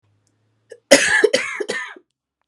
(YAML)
cough_length: 2.5 s
cough_amplitude: 32768
cough_signal_mean_std_ratio: 0.38
survey_phase: beta (2021-08-13 to 2022-03-07)
age: 45-64
gender: Female
wearing_mask: 'No'
symptom_runny_or_blocked_nose: true
symptom_shortness_of_breath: true
symptom_sore_throat: true
symptom_fatigue: true
symptom_fever_high_temperature: true
symptom_headache: true
smoker_status: Ex-smoker
respiratory_condition_asthma: true
respiratory_condition_other: false
recruitment_source: Test and Trace
submission_delay: 2 days
covid_test_result: Positive
covid_test_method: RT-qPCR